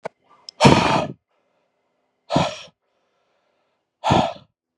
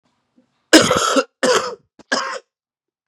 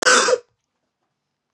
{"exhalation_length": "4.8 s", "exhalation_amplitude": 32768, "exhalation_signal_mean_std_ratio": 0.34, "three_cough_length": "3.1 s", "three_cough_amplitude": 32768, "three_cough_signal_mean_std_ratio": 0.41, "cough_length": "1.5 s", "cough_amplitude": 25659, "cough_signal_mean_std_ratio": 0.38, "survey_phase": "beta (2021-08-13 to 2022-03-07)", "age": "18-44", "gender": "Male", "wearing_mask": "No", "symptom_cough_any": true, "symptom_new_continuous_cough": true, "symptom_runny_or_blocked_nose": true, "symptom_shortness_of_breath": true, "symptom_sore_throat": true, "symptom_fatigue": true, "symptom_fever_high_temperature": true, "symptom_headache": true, "symptom_change_to_sense_of_smell_or_taste": true, "symptom_onset": "2 days", "smoker_status": "Current smoker (e-cigarettes or vapes only)", "respiratory_condition_asthma": false, "respiratory_condition_other": false, "recruitment_source": "Test and Trace", "submission_delay": "2 days", "covid_test_result": "Positive", "covid_test_method": "RT-qPCR", "covid_ct_value": 15.3, "covid_ct_gene": "N gene", "covid_ct_mean": 16.2, "covid_viral_load": "5000000 copies/ml", "covid_viral_load_category": "High viral load (>1M copies/ml)"}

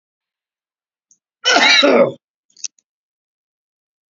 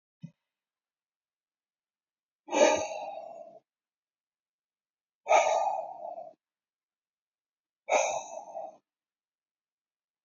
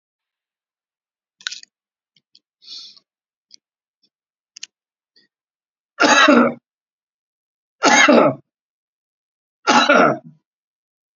{"cough_length": "4.1 s", "cough_amplitude": 32222, "cough_signal_mean_std_ratio": 0.33, "exhalation_length": "10.2 s", "exhalation_amplitude": 10738, "exhalation_signal_mean_std_ratio": 0.31, "three_cough_length": "11.2 s", "three_cough_amplitude": 31372, "three_cough_signal_mean_std_ratio": 0.3, "survey_phase": "beta (2021-08-13 to 2022-03-07)", "age": "65+", "gender": "Male", "wearing_mask": "No", "symptom_none": true, "smoker_status": "Ex-smoker", "respiratory_condition_asthma": false, "respiratory_condition_other": false, "recruitment_source": "REACT", "submission_delay": "1 day", "covid_test_result": "Negative", "covid_test_method": "RT-qPCR"}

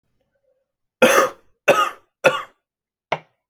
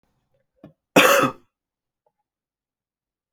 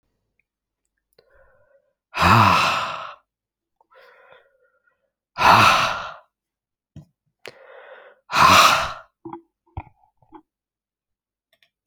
{"three_cough_length": "3.5 s", "three_cough_amplitude": 32767, "three_cough_signal_mean_std_ratio": 0.34, "cough_length": "3.3 s", "cough_amplitude": 28900, "cough_signal_mean_std_ratio": 0.25, "exhalation_length": "11.9 s", "exhalation_amplitude": 29251, "exhalation_signal_mean_std_ratio": 0.33, "survey_phase": "beta (2021-08-13 to 2022-03-07)", "age": "18-44", "gender": "Male", "wearing_mask": "No", "symptom_cough_any": true, "symptom_runny_or_blocked_nose": true, "symptom_shortness_of_breath": true, "symptom_sore_throat": true, "symptom_fatigue": true, "symptom_fever_high_temperature": true, "symptom_headache": true, "symptom_other": true, "symptom_onset": "3 days", "smoker_status": "Never smoked", "respiratory_condition_asthma": false, "respiratory_condition_other": false, "recruitment_source": "Test and Trace", "submission_delay": "2 days", "covid_test_result": "Positive", "covid_test_method": "RT-qPCR", "covid_ct_value": 31.2, "covid_ct_gene": "N gene"}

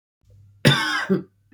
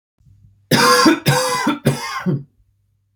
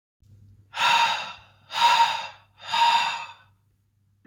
{"cough_length": "1.5 s", "cough_amplitude": 27638, "cough_signal_mean_std_ratio": 0.46, "three_cough_length": "3.2 s", "three_cough_amplitude": 31323, "three_cough_signal_mean_std_ratio": 0.57, "exhalation_length": "4.3 s", "exhalation_amplitude": 14342, "exhalation_signal_mean_std_ratio": 0.52, "survey_phase": "beta (2021-08-13 to 2022-03-07)", "age": "18-44", "gender": "Male", "wearing_mask": "No", "symptom_cough_any": true, "symptom_new_continuous_cough": true, "symptom_runny_or_blocked_nose": true, "symptom_sore_throat": true, "symptom_fatigue": true, "symptom_onset": "3 days", "smoker_status": "Never smoked", "respiratory_condition_asthma": false, "respiratory_condition_other": false, "recruitment_source": "Test and Trace", "submission_delay": "1 day", "covid_test_result": "Negative", "covid_test_method": "RT-qPCR"}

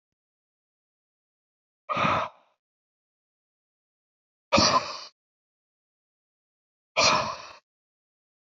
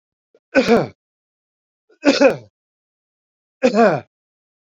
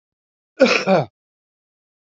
{"exhalation_length": "8.5 s", "exhalation_amplitude": 14234, "exhalation_signal_mean_std_ratio": 0.28, "three_cough_length": "4.7 s", "three_cough_amplitude": 32767, "three_cough_signal_mean_std_ratio": 0.34, "cough_length": "2.0 s", "cough_amplitude": 28766, "cough_signal_mean_std_ratio": 0.34, "survey_phase": "beta (2021-08-13 to 2022-03-07)", "age": "45-64", "gender": "Male", "wearing_mask": "No", "symptom_none": true, "smoker_status": "Ex-smoker", "respiratory_condition_asthma": false, "respiratory_condition_other": false, "recruitment_source": "REACT", "submission_delay": "1 day", "covid_test_result": "Negative", "covid_test_method": "RT-qPCR"}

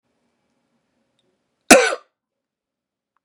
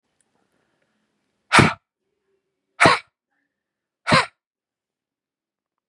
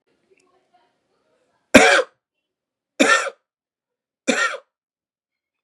{"cough_length": "3.2 s", "cough_amplitude": 32768, "cough_signal_mean_std_ratio": 0.19, "exhalation_length": "5.9 s", "exhalation_amplitude": 32487, "exhalation_signal_mean_std_ratio": 0.23, "three_cough_length": "5.6 s", "three_cough_amplitude": 32768, "three_cough_signal_mean_std_ratio": 0.27, "survey_phase": "beta (2021-08-13 to 2022-03-07)", "age": "45-64", "gender": "Male", "wearing_mask": "No", "symptom_change_to_sense_of_smell_or_taste": true, "symptom_onset": "12 days", "smoker_status": "Never smoked", "respiratory_condition_asthma": false, "respiratory_condition_other": false, "recruitment_source": "REACT", "submission_delay": "2 days", "covid_test_result": "Negative", "covid_test_method": "RT-qPCR", "influenza_a_test_result": "Negative", "influenza_b_test_result": "Negative"}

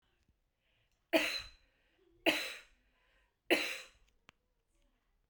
{"three_cough_length": "5.3 s", "three_cough_amplitude": 5680, "three_cough_signal_mean_std_ratio": 0.28, "survey_phase": "beta (2021-08-13 to 2022-03-07)", "age": "45-64", "gender": "Female", "wearing_mask": "No", "symptom_runny_or_blocked_nose": true, "symptom_sore_throat": true, "symptom_fatigue": true, "symptom_headache": true, "smoker_status": "Never smoked", "respiratory_condition_asthma": false, "respiratory_condition_other": false, "recruitment_source": "REACT", "submission_delay": "1 day", "covid_test_result": "Negative", "covid_test_method": "RT-qPCR"}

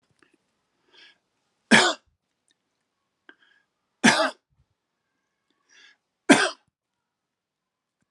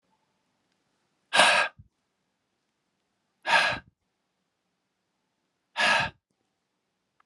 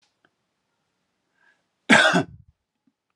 {"three_cough_length": "8.1 s", "three_cough_amplitude": 27743, "three_cough_signal_mean_std_ratio": 0.21, "exhalation_length": "7.3 s", "exhalation_amplitude": 25304, "exhalation_signal_mean_std_ratio": 0.28, "cough_length": "3.2 s", "cough_amplitude": 28188, "cough_signal_mean_std_ratio": 0.25, "survey_phase": "alpha (2021-03-01 to 2021-08-12)", "age": "45-64", "gender": "Male", "wearing_mask": "No", "symptom_none": true, "smoker_status": "Never smoked", "respiratory_condition_asthma": false, "respiratory_condition_other": false, "recruitment_source": "REACT", "submission_delay": "1 day", "covid_test_result": "Negative", "covid_test_method": "RT-qPCR"}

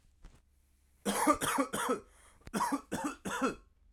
{"cough_length": "3.9 s", "cough_amplitude": 7779, "cough_signal_mean_std_ratio": 0.53, "survey_phase": "alpha (2021-03-01 to 2021-08-12)", "age": "18-44", "gender": "Male", "wearing_mask": "No", "symptom_change_to_sense_of_smell_or_taste": true, "symptom_loss_of_taste": true, "symptom_onset": "6 days", "smoker_status": "Ex-smoker", "respiratory_condition_asthma": false, "respiratory_condition_other": false, "recruitment_source": "Test and Trace", "submission_delay": "1 day", "covid_test_result": "Positive", "covid_test_method": "RT-qPCR", "covid_ct_value": 21.2, "covid_ct_gene": "N gene"}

